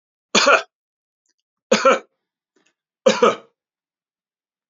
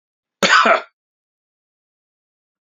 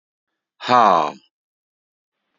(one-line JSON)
{"three_cough_length": "4.7 s", "three_cough_amplitude": 31333, "three_cough_signal_mean_std_ratio": 0.3, "cough_length": "2.6 s", "cough_amplitude": 32767, "cough_signal_mean_std_ratio": 0.29, "exhalation_length": "2.4 s", "exhalation_amplitude": 27549, "exhalation_signal_mean_std_ratio": 0.3, "survey_phase": "beta (2021-08-13 to 2022-03-07)", "age": "45-64", "gender": "Male", "wearing_mask": "No", "symptom_none": true, "smoker_status": "Ex-smoker", "respiratory_condition_asthma": false, "respiratory_condition_other": false, "recruitment_source": "REACT", "submission_delay": "2 days", "covid_test_result": "Negative", "covid_test_method": "RT-qPCR", "influenza_a_test_result": "Negative", "influenza_b_test_result": "Negative"}